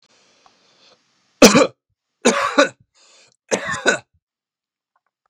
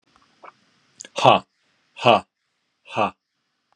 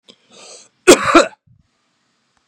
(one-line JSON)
{"three_cough_length": "5.3 s", "three_cough_amplitude": 32768, "three_cough_signal_mean_std_ratio": 0.29, "exhalation_length": "3.8 s", "exhalation_amplitude": 32398, "exhalation_signal_mean_std_ratio": 0.26, "cough_length": "2.5 s", "cough_amplitude": 32768, "cough_signal_mean_std_ratio": 0.28, "survey_phase": "beta (2021-08-13 to 2022-03-07)", "age": "45-64", "gender": "Male", "wearing_mask": "No", "symptom_none": true, "smoker_status": "Never smoked", "respiratory_condition_asthma": false, "respiratory_condition_other": false, "recruitment_source": "REACT", "submission_delay": "1 day", "covid_test_result": "Negative", "covid_test_method": "RT-qPCR", "influenza_a_test_result": "Negative", "influenza_b_test_result": "Negative"}